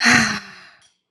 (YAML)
exhalation_length: 1.1 s
exhalation_amplitude: 27171
exhalation_signal_mean_std_ratio: 0.49
survey_phase: alpha (2021-03-01 to 2021-08-12)
age: 18-44
gender: Female
wearing_mask: 'No'
symptom_cough_any: true
symptom_new_continuous_cough: true
symptom_fatigue: true
symptom_fever_high_temperature: true
symptom_headache: true
symptom_change_to_sense_of_smell_or_taste: true
symptom_loss_of_taste: true
symptom_onset: 3 days
smoker_status: Never smoked
respiratory_condition_asthma: false
respiratory_condition_other: false
recruitment_source: Test and Trace
submission_delay: 2 days
covid_test_result: Positive
covid_test_method: RT-qPCR